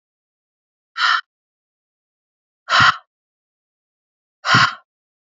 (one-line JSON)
{"exhalation_length": "5.3 s", "exhalation_amplitude": 29116, "exhalation_signal_mean_std_ratio": 0.29, "survey_phase": "beta (2021-08-13 to 2022-03-07)", "age": "18-44", "gender": "Female", "wearing_mask": "No", "symptom_cough_any": true, "symptom_runny_or_blocked_nose": true, "symptom_shortness_of_breath": true, "symptom_sore_throat": true, "symptom_fatigue": true, "symptom_other": true, "symptom_onset": "3 days", "smoker_status": "Never smoked", "respiratory_condition_asthma": false, "respiratory_condition_other": false, "recruitment_source": "Test and Trace", "submission_delay": "1 day", "covid_test_result": "Positive", "covid_test_method": "ePCR"}